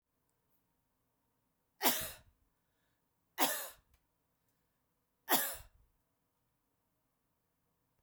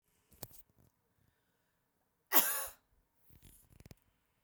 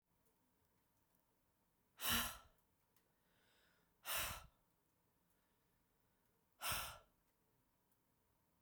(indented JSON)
{
  "three_cough_length": "8.0 s",
  "three_cough_amplitude": 8686,
  "three_cough_signal_mean_std_ratio": 0.23,
  "cough_length": "4.4 s",
  "cough_amplitude": 11228,
  "cough_signal_mean_std_ratio": 0.2,
  "exhalation_length": "8.6 s",
  "exhalation_amplitude": 1570,
  "exhalation_signal_mean_std_ratio": 0.28,
  "survey_phase": "beta (2021-08-13 to 2022-03-07)",
  "age": "45-64",
  "gender": "Female",
  "wearing_mask": "No",
  "symptom_other": true,
  "symptom_onset": "4 days",
  "smoker_status": "Never smoked",
  "respiratory_condition_asthma": false,
  "respiratory_condition_other": false,
  "recruitment_source": "REACT",
  "submission_delay": "2 days",
  "covid_test_result": "Negative",
  "covid_test_method": "RT-qPCR",
  "influenza_a_test_result": "Negative",
  "influenza_b_test_result": "Negative"
}